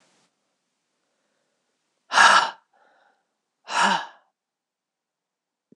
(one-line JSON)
{"exhalation_length": "5.8 s", "exhalation_amplitude": 24883, "exhalation_signal_mean_std_ratio": 0.25, "survey_phase": "beta (2021-08-13 to 2022-03-07)", "age": "45-64", "gender": "Female", "wearing_mask": "No", "symptom_cough_any": true, "symptom_runny_or_blocked_nose": true, "symptom_fatigue": true, "symptom_change_to_sense_of_smell_or_taste": true, "symptom_loss_of_taste": true, "symptom_other": true, "symptom_onset": "4 days", "smoker_status": "Ex-smoker", "respiratory_condition_asthma": false, "respiratory_condition_other": false, "recruitment_source": "Test and Trace", "submission_delay": "2 days", "covid_test_result": "Positive", "covid_test_method": "RT-qPCR"}